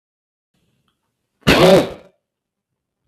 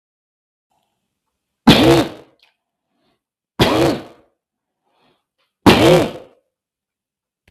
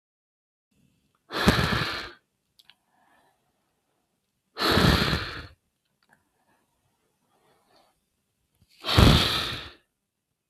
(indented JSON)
{
  "cough_length": "3.1 s",
  "cough_amplitude": 32768,
  "cough_signal_mean_std_ratio": 0.3,
  "three_cough_length": "7.5 s",
  "three_cough_amplitude": 32768,
  "three_cough_signal_mean_std_ratio": 0.32,
  "exhalation_length": "10.5 s",
  "exhalation_amplitude": 32768,
  "exhalation_signal_mean_std_ratio": 0.32,
  "survey_phase": "beta (2021-08-13 to 2022-03-07)",
  "age": "45-64",
  "gender": "Male",
  "wearing_mask": "No",
  "symptom_none": true,
  "smoker_status": "Ex-smoker",
  "respiratory_condition_asthma": false,
  "respiratory_condition_other": false,
  "recruitment_source": "REACT",
  "submission_delay": "2 days",
  "covid_test_result": "Negative",
  "covid_test_method": "RT-qPCR",
  "influenza_a_test_result": "Negative",
  "influenza_b_test_result": "Negative"
}